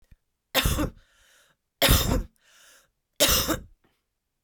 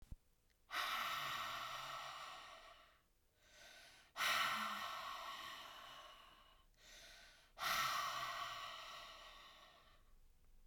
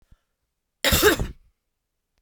three_cough_length: 4.4 s
three_cough_amplitude: 17846
three_cough_signal_mean_std_ratio: 0.4
exhalation_length: 10.7 s
exhalation_amplitude: 1426
exhalation_signal_mean_std_ratio: 0.62
cough_length: 2.2 s
cough_amplitude: 19073
cough_signal_mean_std_ratio: 0.34
survey_phase: beta (2021-08-13 to 2022-03-07)
age: 45-64
gender: Female
wearing_mask: 'No'
symptom_cough_any: true
symptom_runny_or_blocked_nose: true
symptom_sore_throat: true
symptom_fatigue: true
symptom_headache: true
smoker_status: Never smoked
respiratory_condition_asthma: false
respiratory_condition_other: false
recruitment_source: Test and Trace
submission_delay: 2 days
covid_test_result: Positive
covid_test_method: RT-qPCR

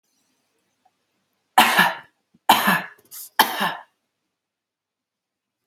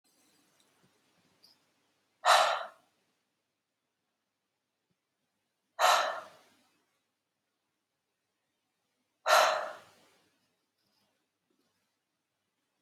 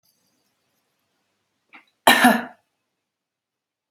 three_cough_length: 5.7 s
three_cough_amplitude: 32768
three_cough_signal_mean_std_ratio: 0.31
exhalation_length: 12.8 s
exhalation_amplitude: 10406
exhalation_signal_mean_std_ratio: 0.23
cough_length: 3.9 s
cough_amplitude: 30239
cough_signal_mean_std_ratio: 0.22
survey_phase: beta (2021-08-13 to 2022-03-07)
age: 18-44
gender: Female
wearing_mask: 'No'
symptom_sore_throat: true
symptom_fatigue: true
smoker_status: Ex-smoker
respiratory_condition_asthma: false
respiratory_condition_other: false
recruitment_source: REACT
submission_delay: 1 day
covid_test_result: Negative
covid_test_method: RT-qPCR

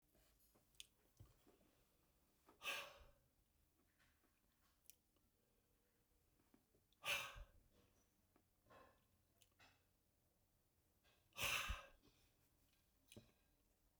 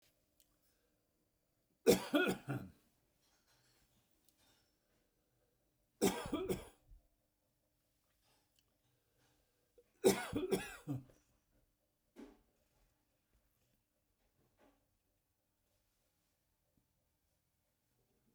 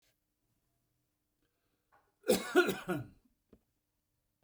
exhalation_length: 14.0 s
exhalation_amplitude: 962
exhalation_signal_mean_std_ratio: 0.28
three_cough_length: 18.3 s
three_cough_amplitude: 5066
three_cough_signal_mean_std_ratio: 0.22
cough_length: 4.4 s
cough_amplitude: 6276
cough_signal_mean_std_ratio: 0.26
survey_phase: beta (2021-08-13 to 2022-03-07)
age: 45-64
gender: Male
wearing_mask: 'No'
symptom_none: true
smoker_status: Ex-smoker
respiratory_condition_asthma: false
respiratory_condition_other: false
recruitment_source: REACT
submission_delay: 2 days
covid_test_result: Negative
covid_test_method: RT-qPCR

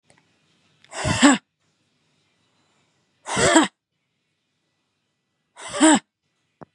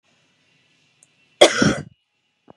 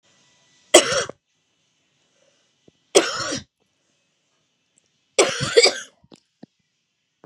exhalation_length: 6.7 s
exhalation_amplitude: 29742
exhalation_signal_mean_std_ratio: 0.29
cough_length: 2.6 s
cough_amplitude: 32768
cough_signal_mean_std_ratio: 0.25
three_cough_length: 7.3 s
three_cough_amplitude: 32768
three_cough_signal_mean_std_ratio: 0.26
survey_phase: beta (2021-08-13 to 2022-03-07)
age: 18-44
gender: Female
wearing_mask: 'No'
symptom_cough_any: true
symptom_fatigue: true
symptom_fever_high_temperature: true
symptom_headache: true
symptom_change_to_sense_of_smell_or_taste: true
smoker_status: Current smoker (e-cigarettes or vapes only)
respiratory_condition_asthma: false
respiratory_condition_other: false
recruitment_source: Test and Trace
submission_delay: 2 days
covid_test_result: Positive
covid_test_method: RT-qPCR
covid_ct_value: 19.4
covid_ct_gene: ORF1ab gene
covid_ct_mean: 20.0
covid_viral_load: 280000 copies/ml
covid_viral_load_category: Low viral load (10K-1M copies/ml)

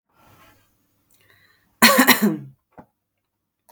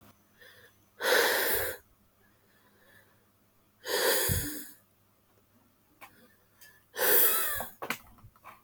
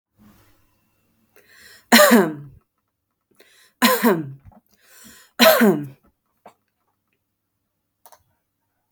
cough_length: 3.7 s
cough_amplitude: 32768
cough_signal_mean_std_ratio: 0.28
exhalation_length: 8.6 s
exhalation_amplitude: 9949
exhalation_signal_mean_std_ratio: 0.43
three_cough_length: 8.9 s
three_cough_amplitude: 32767
three_cough_signal_mean_std_ratio: 0.3
survey_phase: beta (2021-08-13 to 2022-03-07)
age: 18-44
gender: Female
wearing_mask: 'No'
symptom_none: true
smoker_status: Current smoker (1 to 10 cigarettes per day)
respiratory_condition_asthma: false
respiratory_condition_other: false
recruitment_source: REACT
submission_delay: 1 day
covid_test_result: Negative
covid_test_method: RT-qPCR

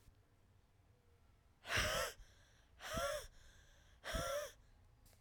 exhalation_length: 5.2 s
exhalation_amplitude: 1668
exhalation_signal_mean_std_ratio: 0.48
survey_phase: alpha (2021-03-01 to 2021-08-12)
age: 18-44
gender: Female
wearing_mask: 'No'
symptom_cough_any: true
symptom_shortness_of_breath: true
symptom_fatigue: true
symptom_fever_high_temperature: true
symptom_headache: true
symptom_onset: 3 days
smoker_status: Never smoked
respiratory_condition_asthma: false
respiratory_condition_other: false
recruitment_source: Test and Trace
submission_delay: 1 day
covid_test_result: Positive
covid_test_method: RT-qPCR
covid_ct_value: 23.7
covid_ct_gene: N gene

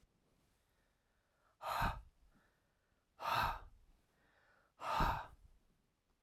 exhalation_length: 6.2 s
exhalation_amplitude: 2522
exhalation_signal_mean_std_ratio: 0.36
survey_phase: alpha (2021-03-01 to 2021-08-12)
age: 65+
gender: Male
wearing_mask: 'No'
symptom_none: true
smoker_status: Ex-smoker
respiratory_condition_asthma: false
respiratory_condition_other: false
recruitment_source: REACT
submission_delay: 1 day
covid_test_result: Negative
covid_test_method: RT-qPCR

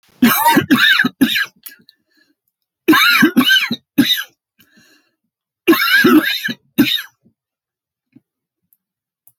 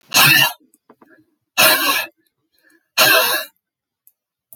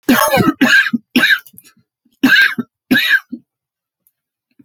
three_cough_length: 9.4 s
three_cough_amplitude: 31467
three_cough_signal_mean_std_ratio: 0.48
exhalation_length: 4.6 s
exhalation_amplitude: 32768
exhalation_signal_mean_std_ratio: 0.44
cough_length: 4.6 s
cough_amplitude: 30404
cough_signal_mean_std_ratio: 0.51
survey_phase: alpha (2021-03-01 to 2021-08-12)
age: 65+
gender: Male
wearing_mask: 'No'
symptom_none: true
smoker_status: Never smoked
respiratory_condition_asthma: false
respiratory_condition_other: false
recruitment_source: REACT
submission_delay: 2 days
covid_test_result: Negative
covid_test_method: RT-qPCR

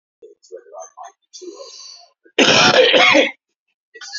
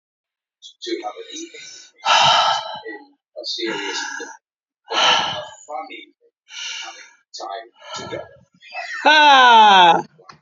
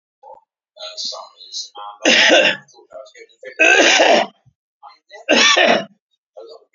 cough_length: 4.2 s
cough_amplitude: 32768
cough_signal_mean_std_ratio: 0.43
exhalation_length: 10.4 s
exhalation_amplitude: 31304
exhalation_signal_mean_std_ratio: 0.46
three_cough_length: 6.7 s
three_cough_amplitude: 31566
three_cough_signal_mean_std_ratio: 0.47
survey_phase: beta (2021-08-13 to 2022-03-07)
age: 65+
gender: Male
wearing_mask: 'No'
symptom_cough_any: true
symptom_runny_or_blocked_nose: true
symptom_sore_throat: true
symptom_headache: true
smoker_status: Never smoked
respiratory_condition_asthma: false
respiratory_condition_other: false
recruitment_source: Test and Trace
submission_delay: 3 days
covid_test_method: RT-qPCR
covid_ct_value: 34.9
covid_ct_gene: N gene
covid_ct_mean: 34.9
covid_viral_load: 3.5 copies/ml
covid_viral_load_category: Minimal viral load (< 10K copies/ml)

